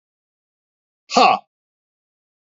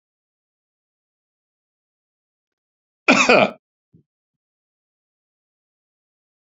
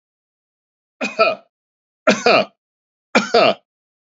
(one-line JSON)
{"exhalation_length": "2.5 s", "exhalation_amplitude": 31009, "exhalation_signal_mean_std_ratio": 0.24, "cough_length": "6.5 s", "cough_amplitude": 32243, "cough_signal_mean_std_ratio": 0.18, "three_cough_length": "4.0 s", "three_cough_amplitude": 29700, "three_cough_signal_mean_std_ratio": 0.36, "survey_phase": "beta (2021-08-13 to 2022-03-07)", "age": "65+", "gender": "Male", "wearing_mask": "No", "symptom_cough_any": true, "smoker_status": "Ex-smoker", "respiratory_condition_asthma": true, "respiratory_condition_other": false, "recruitment_source": "REACT", "submission_delay": "2 days", "covid_test_result": "Negative", "covid_test_method": "RT-qPCR", "influenza_a_test_result": "Negative", "influenza_b_test_result": "Negative"}